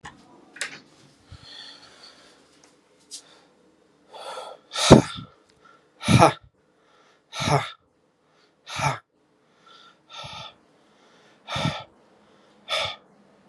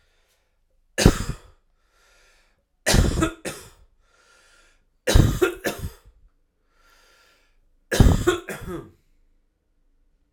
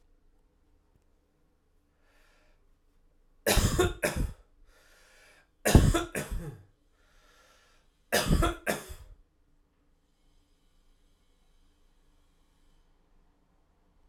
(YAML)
exhalation_length: 13.5 s
exhalation_amplitude: 32768
exhalation_signal_mean_std_ratio: 0.25
cough_length: 10.3 s
cough_amplitude: 32768
cough_signal_mean_std_ratio: 0.31
three_cough_length: 14.1 s
three_cough_amplitude: 20916
three_cough_signal_mean_std_ratio: 0.28
survey_phase: alpha (2021-03-01 to 2021-08-12)
age: 18-44
gender: Male
wearing_mask: 'No'
symptom_cough_any: true
symptom_new_continuous_cough: true
symptom_shortness_of_breath: true
smoker_status: Ex-smoker
respiratory_condition_asthma: false
respiratory_condition_other: false
recruitment_source: Test and Trace
submission_delay: 2 days
covid_test_result: Positive
covid_test_method: RT-qPCR
covid_ct_value: 29.2
covid_ct_gene: N gene